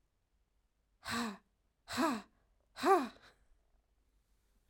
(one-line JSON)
{"exhalation_length": "4.7 s", "exhalation_amplitude": 4236, "exhalation_signal_mean_std_ratio": 0.32, "survey_phase": "alpha (2021-03-01 to 2021-08-12)", "age": "18-44", "gender": "Female", "wearing_mask": "No", "symptom_diarrhoea": true, "symptom_fatigue": true, "symptom_headache": true, "symptom_onset": "3 days", "smoker_status": "Never smoked", "respiratory_condition_asthma": false, "respiratory_condition_other": false, "recruitment_source": "Test and Trace", "submission_delay": "1 day", "covid_test_result": "Positive", "covid_test_method": "RT-qPCR", "covid_ct_value": 28.4, "covid_ct_gene": "N gene"}